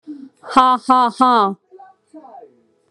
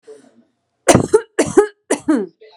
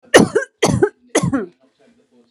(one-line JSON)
{"exhalation_length": "2.9 s", "exhalation_amplitude": 32767, "exhalation_signal_mean_std_ratio": 0.45, "cough_length": "2.6 s", "cough_amplitude": 32768, "cough_signal_mean_std_ratio": 0.4, "three_cough_length": "2.3 s", "three_cough_amplitude": 32768, "three_cough_signal_mean_std_ratio": 0.43, "survey_phase": "alpha (2021-03-01 to 2021-08-12)", "age": "18-44", "gender": "Female", "wearing_mask": "Yes", "symptom_none": true, "smoker_status": "Ex-smoker", "recruitment_source": "REACT", "submission_delay": "1 day", "covid_test_result": "Negative", "covid_test_method": "RT-qPCR"}